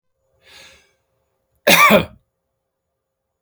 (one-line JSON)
{"cough_length": "3.4 s", "cough_amplitude": 31464, "cough_signal_mean_std_ratio": 0.27, "survey_phase": "beta (2021-08-13 to 2022-03-07)", "age": "65+", "gender": "Male", "wearing_mask": "No", "symptom_none": true, "smoker_status": "Ex-smoker", "respiratory_condition_asthma": false, "respiratory_condition_other": false, "recruitment_source": "REACT", "submission_delay": "1 day", "covid_test_result": "Negative", "covid_test_method": "RT-qPCR"}